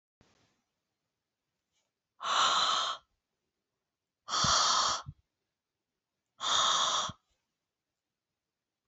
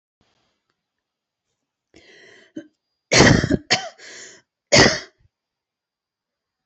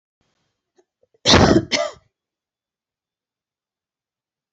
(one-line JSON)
{"exhalation_length": "8.9 s", "exhalation_amplitude": 6357, "exhalation_signal_mean_std_ratio": 0.41, "three_cough_length": "6.7 s", "three_cough_amplitude": 32280, "three_cough_signal_mean_std_ratio": 0.27, "cough_length": "4.5 s", "cough_amplitude": 29371, "cough_signal_mean_std_ratio": 0.26, "survey_phase": "beta (2021-08-13 to 2022-03-07)", "age": "18-44", "gender": "Female", "wearing_mask": "No", "symptom_headache": true, "smoker_status": "Never smoked", "respiratory_condition_asthma": false, "respiratory_condition_other": false, "recruitment_source": "REACT", "submission_delay": "3 days", "covid_test_result": "Negative", "covid_test_method": "RT-qPCR"}